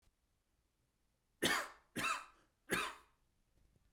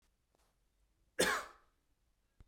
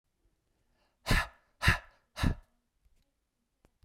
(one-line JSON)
{"three_cough_length": "3.9 s", "three_cough_amplitude": 3107, "three_cough_signal_mean_std_ratio": 0.35, "cough_length": "2.5 s", "cough_amplitude": 3877, "cough_signal_mean_std_ratio": 0.26, "exhalation_length": "3.8 s", "exhalation_amplitude": 9546, "exhalation_signal_mean_std_ratio": 0.27, "survey_phase": "beta (2021-08-13 to 2022-03-07)", "age": "18-44", "gender": "Male", "wearing_mask": "No", "symptom_none": true, "smoker_status": "Never smoked", "respiratory_condition_asthma": false, "respiratory_condition_other": false, "recruitment_source": "REACT", "submission_delay": "1 day", "covid_test_result": "Negative", "covid_test_method": "RT-qPCR"}